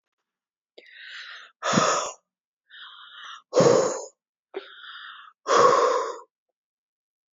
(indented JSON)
{
  "exhalation_length": "7.3 s",
  "exhalation_amplitude": 22094,
  "exhalation_signal_mean_std_ratio": 0.4,
  "survey_phase": "beta (2021-08-13 to 2022-03-07)",
  "age": "18-44",
  "gender": "Female",
  "wearing_mask": "No",
  "symptom_none": true,
  "smoker_status": "Never smoked",
  "respiratory_condition_asthma": false,
  "respiratory_condition_other": false,
  "recruitment_source": "REACT",
  "submission_delay": "1 day",
  "covid_test_result": "Negative",
  "covid_test_method": "RT-qPCR",
  "influenza_a_test_result": "Negative",
  "influenza_b_test_result": "Negative"
}